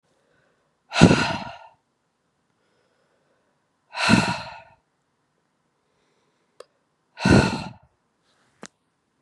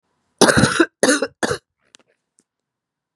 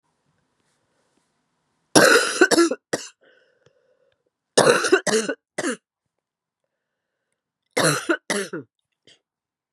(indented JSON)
{
  "exhalation_length": "9.2 s",
  "exhalation_amplitude": 32768,
  "exhalation_signal_mean_std_ratio": 0.26,
  "cough_length": "3.2 s",
  "cough_amplitude": 32768,
  "cough_signal_mean_std_ratio": 0.36,
  "three_cough_length": "9.7 s",
  "three_cough_amplitude": 32768,
  "three_cough_signal_mean_std_ratio": 0.34,
  "survey_phase": "beta (2021-08-13 to 2022-03-07)",
  "age": "45-64",
  "gender": "Female",
  "wearing_mask": "No",
  "symptom_cough_any": true,
  "symptom_new_continuous_cough": true,
  "symptom_runny_or_blocked_nose": true,
  "symptom_sore_throat": true,
  "smoker_status": "Never smoked",
  "respiratory_condition_asthma": false,
  "respiratory_condition_other": false,
  "recruitment_source": "Test and Trace",
  "submission_delay": "2 days",
  "covid_test_result": "Positive",
  "covid_test_method": "LFT"
}